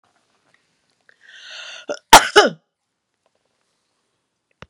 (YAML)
cough_length: 4.7 s
cough_amplitude: 32768
cough_signal_mean_std_ratio: 0.19
survey_phase: beta (2021-08-13 to 2022-03-07)
age: 65+
gender: Female
wearing_mask: 'No'
symptom_none: true
smoker_status: Ex-smoker
respiratory_condition_asthma: false
respiratory_condition_other: false
recruitment_source: REACT
submission_delay: 2 days
covid_test_result: Negative
covid_test_method: RT-qPCR